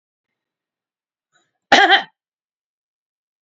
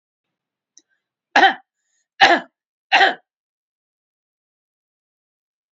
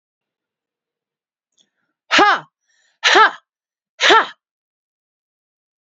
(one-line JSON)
{"cough_length": "3.4 s", "cough_amplitude": 32767, "cough_signal_mean_std_ratio": 0.23, "three_cough_length": "5.7 s", "three_cough_amplitude": 32767, "three_cough_signal_mean_std_ratio": 0.24, "exhalation_length": "5.8 s", "exhalation_amplitude": 32497, "exhalation_signal_mean_std_ratio": 0.28, "survey_phase": "beta (2021-08-13 to 2022-03-07)", "age": "65+", "gender": "Female", "wearing_mask": "No", "symptom_none": true, "smoker_status": "Never smoked", "respiratory_condition_asthma": false, "respiratory_condition_other": false, "recruitment_source": "REACT", "submission_delay": "2 days", "covid_test_result": "Negative", "covid_test_method": "RT-qPCR"}